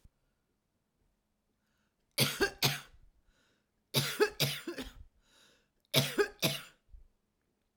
{"three_cough_length": "7.8 s", "three_cough_amplitude": 8618, "three_cough_signal_mean_std_ratio": 0.34, "survey_phase": "beta (2021-08-13 to 2022-03-07)", "age": "45-64", "gender": "Female", "wearing_mask": "No", "symptom_cough_any": true, "symptom_fatigue": true, "symptom_loss_of_taste": true, "smoker_status": "Current smoker (1 to 10 cigarettes per day)", "respiratory_condition_asthma": false, "respiratory_condition_other": false, "recruitment_source": "Test and Trace", "submission_delay": "1 day", "covid_test_result": "Positive", "covid_test_method": "RT-qPCR", "covid_ct_value": 20.6, "covid_ct_gene": "ORF1ab gene"}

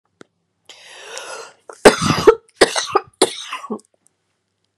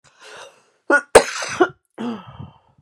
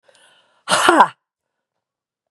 {"three_cough_length": "4.8 s", "three_cough_amplitude": 32768, "three_cough_signal_mean_std_ratio": 0.3, "cough_length": "2.8 s", "cough_amplitude": 32768, "cough_signal_mean_std_ratio": 0.32, "exhalation_length": "2.3 s", "exhalation_amplitude": 32768, "exhalation_signal_mean_std_ratio": 0.31, "survey_phase": "beta (2021-08-13 to 2022-03-07)", "age": "45-64", "gender": "Female", "wearing_mask": "No", "symptom_cough_any": true, "symptom_runny_or_blocked_nose": true, "symptom_abdominal_pain": true, "symptom_fatigue": true, "symptom_onset": "3 days", "smoker_status": "Ex-smoker", "respiratory_condition_asthma": true, "respiratory_condition_other": false, "recruitment_source": "Test and Trace", "submission_delay": "1 day", "covid_test_result": "Positive", "covid_test_method": "RT-qPCR", "covid_ct_value": 23.8, "covid_ct_gene": "N gene"}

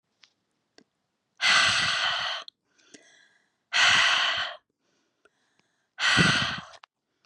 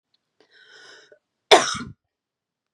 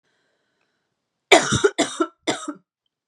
{"exhalation_length": "7.3 s", "exhalation_amplitude": 13631, "exhalation_signal_mean_std_ratio": 0.47, "cough_length": "2.7 s", "cough_amplitude": 32767, "cough_signal_mean_std_ratio": 0.2, "three_cough_length": "3.1 s", "three_cough_amplitude": 32768, "three_cough_signal_mean_std_ratio": 0.32, "survey_phase": "beta (2021-08-13 to 2022-03-07)", "age": "18-44", "gender": "Female", "wearing_mask": "No", "symptom_cough_any": true, "symptom_sore_throat": true, "symptom_fatigue": true, "symptom_headache": true, "symptom_onset": "2 days", "smoker_status": "Never smoked", "respiratory_condition_asthma": false, "respiratory_condition_other": false, "recruitment_source": "Test and Trace", "submission_delay": "1 day", "covid_test_result": "Positive", "covid_test_method": "RT-qPCR", "covid_ct_value": 20.8, "covid_ct_gene": "ORF1ab gene", "covid_ct_mean": 21.2, "covid_viral_load": "110000 copies/ml", "covid_viral_load_category": "Low viral load (10K-1M copies/ml)"}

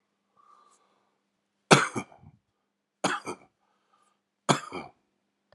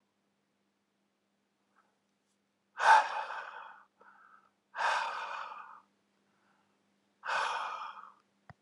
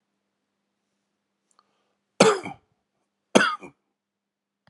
{"three_cough_length": "5.5 s", "three_cough_amplitude": 32642, "three_cough_signal_mean_std_ratio": 0.21, "exhalation_length": "8.6 s", "exhalation_amplitude": 9806, "exhalation_signal_mean_std_ratio": 0.32, "cough_length": "4.7 s", "cough_amplitude": 32767, "cough_signal_mean_std_ratio": 0.21, "survey_phase": "alpha (2021-03-01 to 2021-08-12)", "age": "45-64", "gender": "Male", "wearing_mask": "No", "symptom_fatigue": true, "symptom_headache": true, "symptom_change_to_sense_of_smell_or_taste": true, "symptom_onset": "4 days", "smoker_status": "Ex-smoker", "respiratory_condition_asthma": false, "respiratory_condition_other": false, "recruitment_source": "Test and Trace", "submission_delay": "2 days", "covid_test_result": "Positive", "covid_test_method": "RT-qPCR", "covid_ct_value": 23.4, "covid_ct_gene": "ORF1ab gene", "covid_ct_mean": 23.9, "covid_viral_load": "15000 copies/ml", "covid_viral_load_category": "Low viral load (10K-1M copies/ml)"}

